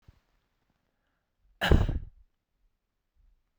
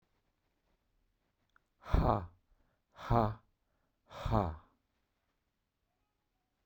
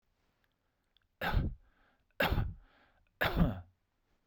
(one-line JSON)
{"cough_length": "3.6 s", "cough_amplitude": 14098, "cough_signal_mean_std_ratio": 0.23, "exhalation_length": "6.7 s", "exhalation_amplitude": 5224, "exhalation_signal_mean_std_ratio": 0.28, "three_cough_length": "4.3 s", "three_cough_amplitude": 6075, "three_cough_signal_mean_std_ratio": 0.39, "survey_phase": "beta (2021-08-13 to 2022-03-07)", "age": "18-44", "gender": "Male", "wearing_mask": "No", "symptom_none": true, "symptom_onset": "13 days", "smoker_status": "Ex-smoker", "respiratory_condition_asthma": false, "respiratory_condition_other": false, "recruitment_source": "REACT", "submission_delay": "1 day", "covid_test_result": "Negative", "covid_test_method": "RT-qPCR"}